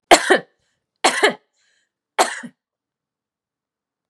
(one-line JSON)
{"three_cough_length": "4.1 s", "three_cough_amplitude": 32768, "three_cough_signal_mean_std_ratio": 0.27, "survey_phase": "beta (2021-08-13 to 2022-03-07)", "age": "18-44", "gender": "Female", "wearing_mask": "No", "symptom_none": true, "smoker_status": "Current smoker (1 to 10 cigarettes per day)", "respiratory_condition_asthma": false, "respiratory_condition_other": false, "recruitment_source": "REACT", "submission_delay": "2 days", "covid_test_result": "Negative", "covid_test_method": "RT-qPCR", "influenza_a_test_result": "Negative", "influenza_b_test_result": "Negative"}